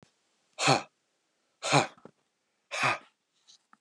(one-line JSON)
{"exhalation_length": "3.8 s", "exhalation_amplitude": 12395, "exhalation_signal_mean_std_ratio": 0.31, "survey_phase": "beta (2021-08-13 to 2022-03-07)", "age": "45-64", "gender": "Male", "wearing_mask": "No", "symptom_none": true, "smoker_status": "Never smoked", "respiratory_condition_asthma": false, "respiratory_condition_other": false, "recruitment_source": "REACT", "submission_delay": "2 days", "covid_test_result": "Negative", "covid_test_method": "RT-qPCR", "influenza_a_test_result": "Unknown/Void", "influenza_b_test_result": "Unknown/Void"}